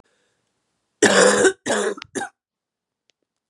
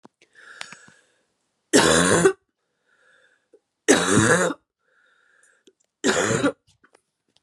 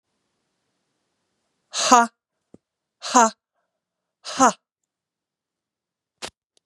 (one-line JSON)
{"cough_length": "3.5 s", "cough_amplitude": 31935, "cough_signal_mean_std_ratio": 0.39, "three_cough_length": "7.4 s", "three_cough_amplitude": 29496, "three_cough_signal_mean_std_ratio": 0.38, "exhalation_length": "6.7 s", "exhalation_amplitude": 32767, "exhalation_signal_mean_std_ratio": 0.22, "survey_phase": "beta (2021-08-13 to 2022-03-07)", "age": "18-44", "gender": "Female", "wearing_mask": "No", "symptom_new_continuous_cough": true, "symptom_runny_or_blocked_nose": true, "symptom_abdominal_pain": true, "symptom_diarrhoea": true, "symptom_fatigue": true, "symptom_fever_high_temperature": true, "symptom_headache": true, "smoker_status": "Never smoked", "respiratory_condition_asthma": false, "respiratory_condition_other": false, "recruitment_source": "Test and Trace", "submission_delay": "1 day", "covid_test_result": "Positive", "covid_test_method": "RT-qPCR", "covid_ct_value": 25.3, "covid_ct_gene": "ORF1ab gene"}